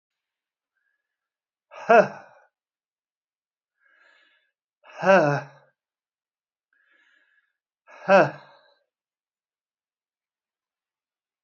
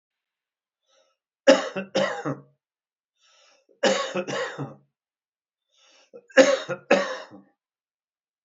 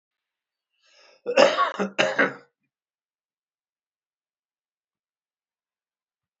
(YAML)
exhalation_length: 11.4 s
exhalation_amplitude: 21277
exhalation_signal_mean_std_ratio: 0.21
three_cough_length: 8.4 s
three_cough_amplitude: 25780
three_cough_signal_mean_std_ratio: 0.31
cough_length: 6.4 s
cough_amplitude: 27231
cough_signal_mean_std_ratio: 0.25
survey_phase: beta (2021-08-13 to 2022-03-07)
age: 65+
gender: Male
wearing_mask: 'No'
symptom_none: true
smoker_status: Never smoked
respiratory_condition_asthma: false
respiratory_condition_other: false
recruitment_source: REACT
submission_delay: 4 days
covid_test_result: Negative
covid_test_method: RT-qPCR
influenza_a_test_result: Negative
influenza_b_test_result: Negative